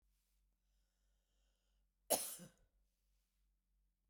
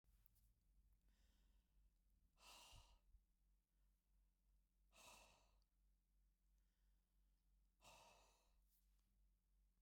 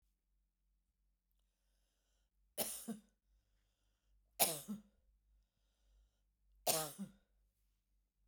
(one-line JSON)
{"cough_length": "4.1 s", "cough_amplitude": 3509, "cough_signal_mean_std_ratio": 0.19, "exhalation_length": "9.8 s", "exhalation_amplitude": 114, "exhalation_signal_mean_std_ratio": 0.78, "three_cough_length": "8.3 s", "three_cough_amplitude": 5337, "three_cough_signal_mean_std_ratio": 0.25, "survey_phase": "beta (2021-08-13 to 2022-03-07)", "age": "45-64", "gender": "Female", "wearing_mask": "No", "symptom_none": true, "smoker_status": "Ex-smoker", "respiratory_condition_asthma": false, "respiratory_condition_other": false, "recruitment_source": "REACT", "submission_delay": "2 days", "covid_test_result": "Negative", "covid_test_method": "RT-qPCR"}